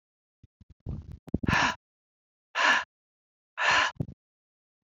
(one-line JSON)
{"exhalation_length": "4.9 s", "exhalation_amplitude": 9915, "exhalation_signal_mean_std_ratio": 0.37, "survey_phase": "beta (2021-08-13 to 2022-03-07)", "age": "45-64", "gender": "Female", "wearing_mask": "No", "symptom_cough_any": true, "symptom_onset": "5 days", "smoker_status": "Never smoked", "respiratory_condition_asthma": false, "respiratory_condition_other": false, "recruitment_source": "REACT", "submission_delay": "1 day", "covid_test_result": "Negative", "covid_test_method": "RT-qPCR"}